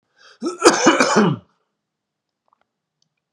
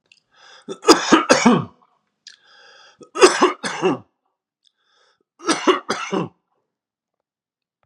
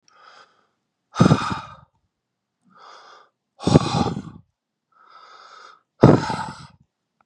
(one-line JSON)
{"cough_length": "3.3 s", "cough_amplitude": 32768, "cough_signal_mean_std_ratio": 0.38, "three_cough_length": "7.9 s", "three_cough_amplitude": 32768, "three_cough_signal_mean_std_ratio": 0.34, "exhalation_length": "7.3 s", "exhalation_amplitude": 32768, "exhalation_signal_mean_std_ratio": 0.28, "survey_phase": "beta (2021-08-13 to 2022-03-07)", "age": "45-64", "gender": "Male", "wearing_mask": "No", "symptom_cough_any": true, "symptom_runny_or_blocked_nose": true, "symptom_sore_throat": true, "symptom_onset": "8 days", "smoker_status": "Ex-smoker", "respiratory_condition_asthma": false, "respiratory_condition_other": false, "recruitment_source": "REACT", "submission_delay": "1 day", "covid_test_result": "Negative", "covid_test_method": "RT-qPCR", "influenza_a_test_result": "Negative", "influenza_b_test_result": "Negative"}